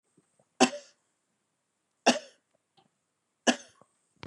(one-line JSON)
{"three_cough_length": "4.3 s", "three_cough_amplitude": 18205, "three_cough_signal_mean_std_ratio": 0.19, "survey_phase": "beta (2021-08-13 to 2022-03-07)", "age": "65+", "gender": "Female", "wearing_mask": "No", "symptom_runny_or_blocked_nose": true, "symptom_onset": "12 days", "smoker_status": "Current smoker (1 to 10 cigarettes per day)", "respiratory_condition_asthma": false, "respiratory_condition_other": false, "recruitment_source": "REACT", "submission_delay": "2 days", "covid_test_result": "Negative", "covid_test_method": "RT-qPCR", "influenza_a_test_result": "Negative", "influenza_b_test_result": "Negative"}